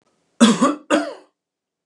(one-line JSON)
{"cough_length": "1.9 s", "cough_amplitude": 32160, "cough_signal_mean_std_ratio": 0.4, "survey_phase": "beta (2021-08-13 to 2022-03-07)", "age": "65+", "gender": "Male", "wearing_mask": "No", "symptom_none": true, "smoker_status": "Never smoked", "respiratory_condition_asthma": false, "respiratory_condition_other": false, "recruitment_source": "REACT", "submission_delay": "5 days", "covid_test_result": "Negative", "covid_test_method": "RT-qPCR", "influenza_a_test_result": "Negative", "influenza_b_test_result": "Negative"}